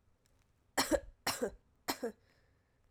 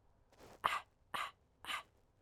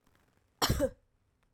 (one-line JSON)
{"three_cough_length": "2.9 s", "three_cough_amplitude": 4519, "three_cough_signal_mean_std_ratio": 0.35, "exhalation_length": "2.2 s", "exhalation_amplitude": 6141, "exhalation_signal_mean_std_ratio": 0.36, "cough_length": "1.5 s", "cough_amplitude": 5590, "cough_signal_mean_std_ratio": 0.34, "survey_phase": "alpha (2021-03-01 to 2021-08-12)", "age": "18-44", "gender": "Female", "wearing_mask": "No", "symptom_cough_any": true, "symptom_new_continuous_cough": true, "symptom_abdominal_pain": true, "symptom_diarrhoea": true, "symptom_fatigue": true, "symptom_fever_high_temperature": true, "symptom_headache": true, "symptom_change_to_sense_of_smell_or_taste": true, "symptom_onset": "3 days", "smoker_status": "Never smoked", "respiratory_condition_asthma": false, "respiratory_condition_other": false, "recruitment_source": "Test and Trace", "submission_delay": "1 day", "covid_test_result": "Positive", "covid_test_method": "RT-qPCR", "covid_ct_value": 13.1, "covid_ct_gene": "ORF1ab gene", "covid_ct_mean": 13.5, "covid_viral_load": "38000000 copies/ml", "covid_viral_load_category": "High viral load (>1M copies/ml)"}